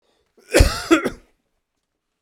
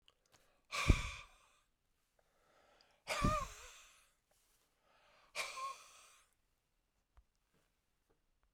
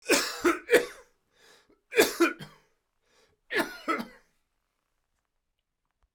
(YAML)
cough_length: 2.2 s
cough_amplitude: 32767
cough_signal_mean_std_ratio: 0.32
exhalation_length: 8.5 s
exhalation_amplitude: 6716
exhalation_signal_mean_std_ratio: 0.26
three_cough_length: 6.1 s
three_cough_amplitude: 14455
three_cough_signal_mean_std_ratio: 0.33
survey_phase: beta (2021-08-13 to 2022-03-07)
age: 45-64
gender: Female
wearing_mask: 'No'
symptom_cough_any: true
symptom_runny_or_blocked_nose: true
symptom_sore_throat: true
symptom_headache: true
symptom_onset: 7 days
smoker_status: Ex-smoker
respiratory_condition_asthma: false
respiratory_condition_other: false
recruitment_source: Test and Trace
submission_delay: 5 days
covid_test_result: Positive
covid_test_method: RT-qPCR
covid_ct_value: 23.7
covid_ct_gene: ORF1ab gene